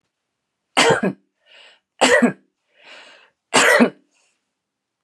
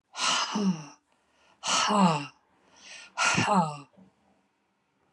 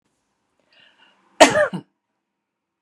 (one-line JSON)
{"three_cough_length": "5.0 s", "three_cough_amplitude": 30321, "three_cough_signal_mean_std_ratio": 0.36, "exhalation_length": "5.1 s", "exhalation_amplitude": 11630, "exhalation_signal_mean_std_ratio": 0.51, "cough_length": "2.8 s", "cough_amplitude": 32768, "cough_signal_mean_std_ratio": 0.23, "survey_phase": "beta (2021-08-13 to 2022-03-07)", "age": "45-64", "gender": "Female", "wearing_mask": "No", "symptom_none": true, "symptom_onset": "8 days", "smoker_status": "Never smoked", "respiratory_condition_asthma": false, "respiratory_condition_other": false, "recruitment_source": "REACT", "submission_delay": "4 days", "covid_test_result": "Negative", "covid_test_method": "RT-qPCR", "influenza_a_test_result": "Negative", "influenza_b_test_result": "Negative"}